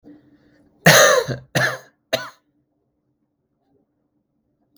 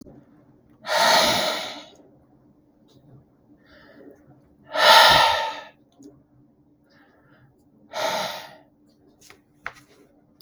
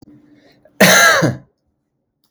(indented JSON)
{
  "three_cough_length": "4.8 s",
  "three_cough_amplitude": 32768,
  "three_cough_signal_mean_std_ratio": 0.29,
  "exhalation_length": "10.4 s",
  "exhalation_amplitude": 32659,
  "exhalation_signal_mean_std_ratio": 0.34,
  "cough_length": "2.3 s",
  "cough_amplitude": 32768,
  "cough_signal_mean_std_ratio": 0.42,
  "survey_phase": "beta (2021-08-13 to 2022-03-07)",
  "age": "18-44",
  "gender": "Male",
  "wearing_mask": "No",
  "symptom_none": true,
  "smoker_status": "Current smoker (1 to 10 cigarettes per day)",
  "respiratory_condition_asthma": false,
  "respiratory_condition_other": false,
  "recruitment_source": "Test and Trace",
  "submission_delay": "1 day",
  "covid_test_result": "Negative",
  "covid_test_method": "RT-qPCR"
}